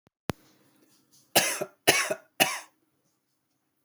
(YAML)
three_cough_length: 3.8 s
three_cough_amplitude: 21512
three_cough_signal_mean_std_ratio: 0.3
survey_phase: beta (2021-08-13 to 2022-03-07)
age: 18-44
gender: Male
wearing_mask: 'No'
symptom_cough_any: true
symptom_shortness_of_breath: true
symptom_fatigue: true
symptom_change_to_sense_of_smell_or_taste: true
symptom_loss_of_taste: true
symptom_onset: 4 days
smoker_status: Never smoked
respiratory_condition_asthma: false
respiratory_condition_other: false
recruitment_source: Test and Trace
submission_delay: 2 days
covid_test_result: Positive
covid_test_method: RT-qPCR
covid_ct_value: 17.9
covid_ct_gene: ORF1ab gene
covid_ct_mean: 18.4
covid_viral_load: 960000 copies/ml
covid_viral_load_category: Low viral load (10K-1M copies/ml)